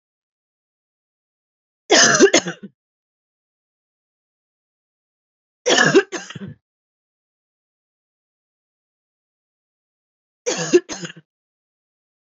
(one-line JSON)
{"three_cough_length": "12.2 s", "three_cough_amplitude": 30960, "three_cough_signal_mean_std_ratio": 0.24, "survey_phase": "beta (2021-08-13 to 2022-03-07)", "age": "18-44", "gender": "Female", "wearing_mask": "No", "symptom_runny_or_blocked_nose": true, "symptom_shortness_of_breath": true, "symptom_abdominal_pain": true, "symptom_headache": true, "symptom_change_to_sense_of_smell_or_taste": true, "symptom_loss_of_taste": true, "symptom_other": true, "smoker_status": "Ex-smoker", "respiratory_condition_asthma": false, "respiratory_condition_other": false, "recruitment_source": "Test and Trace", "submission_delay": "1 day", "covid_test_result": "Positive", "covid_test_method": "ePCR"}